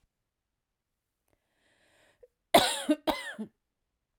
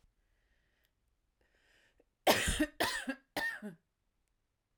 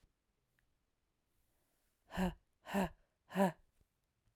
{"cough_length": "4.2 s", "cough_amplitude": 15768, "cough_signal_mean_std_ratio": 0.24, "three_cough_length": "4.8 s", "three_cough_amplitude": 9652, "three_cough_signal_mean_std_ratio": 0.33, "exhalation_length": "4.4 s", "exhalation_amplitude": 2873, "exhalation_signal_mean_std_ratio": 0.28, "survey_phase": "beta (2021-08-13 to 2022-03-07)", "age": "45-64", "gender": "Female", "wearing_mask": "No", "symptom_runny_or_blocked_nose": true, "symptom_fatigue": true, "symptom_headache": true, "symptom_change_to_sense_of_smell_or_taste": true, "symptom_onset": "13 days", "smoker_status": "Never smoked", "respiratory_condition_asthma": false, "respiratory_condition_other": false, "recruitment_source": "Test and Trace", "submission_delay": "5 days", "covid_test_result": "Positive", "covid_test_method": "RT-qPCR", "covid_ct_value": 32.9, "covid_ct_gene": "N gene", "covid_ct_mean": 33.0, "covid_viral_load": "15 copies/ml", "covid_viral_load_category": "Minimal viral load (< 10K copies/ml)"}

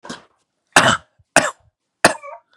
{"three_cough_length": "2.6 s", "three_cough_amplitude": 32768, "three_cough_signal_mean_std_ratio": 0.31, "survey_phase": "beta (2021-08-13 to 2022-03-07)", "age": "18-44", "gender": "Male", "wearing_mask": "No", "symptom_none": true, "smoker_status": "Current smoker (e-cigarettes or vapes only)", "respiratory_condition_asthma": false, "respiratory_condition_other": false, "recruitment_source": "REACT", "submission_delay": "8 days", "covid_test_result": "Negative", "covid_test_method": "RT-qPCR", "influenza_a_test_result": "Negative", "influenza_b_test_result": "Negative"}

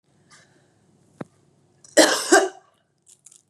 {"cough_length": "3.5 s", "cough_amplitude": 30378, "cough_signal_mean_std_ratio": 0.27, "survey_phase": "beta (2021-08-13 to 2022-03-07)", "age": "18-44", "gender": "Female", "wearing_mask": "No", "symptom_cough_any": true, "symptom_runny_or_blocked_nose": true, "symptom_sore_throat": true, "symptom_fatigue": true, "symptom_headache": true, "smoker_status": "Never smoked", "respiratory_condition_asthma": false, "respiratory_condition_other": false, "recruitment_source": "Test and Trace", "submission_delay": "2 days", "covid_test_result": "Positive", "covid_test_method": "RT-qPCR", "covid_ct_value": 30.6, "covid_ct_gene": "N gene"}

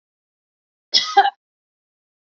{"cough_length": "2.4 s", "cough_amplitude": 28283, "cough_signal_mean_std_ratio": 0.25, "survey_phase": "beta (2021-08-13 to 2022-03-07)", "age": "45-64", "gender": "Female", "wearing_mask": "No", "symptom_none": true, "smoker_status": "Never smoked", "respiratory_condition_asthma": false, "respiratory_condition_other": false, "recruitment_source": "REACT", "submission_delay": "2 days", "covid_test_result": "Negative", "covid_test_method": "RT-qPCR", "influenza_a_test_result": "Negative", "influenza_b_test_result": "Negative"}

